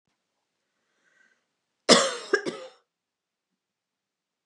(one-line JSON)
{"cough_length": "4.5 s", "cough_amplitude": 28201, "cough_signal_mean_std_ratio": 0.21, "survey_phase": "beta (2021-08-13 to 2022-03-07)", "age": "45-64", "gender": "Female", "wearing_mask": "No", "symptom_none": true, "smoker_status": "Never smoked", "respiratory_condition_asthma": false, "respiratory_condition_other": false, "recruitment_source": "REACT", "submission_delay": "1 day", "covid_test_result": "Negative", "covid_test_method": "RT-qPCR", "influenza_a_test_result": "Negative", "influenza_b_test_result": "Negative"}